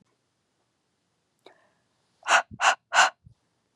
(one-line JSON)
{"exhalation_length": "3.8 s", "exhalation_amplitude": 19505, "exhalation_signal_mean_std_ratio": 0.27, "survey_phase": "beta (2021-08-13 to 2022-03-07)", "age": "18-44", "gender": "Female", "wearing_mask": "No", "symptom_none": true, "symptom_onset": "8 days", "smoker_status": "Never smoked", "respiratory_condition_asthma": false, "respiratory_condition_other": false, "recruitment_source": "REACT", "submission_delay": "2 days", "covid_test_result": "Negative", "covid_test_method": "RT-qPCR", "influenza_a_test_result": "Negative", "influenza_b_test_result": "Negative"}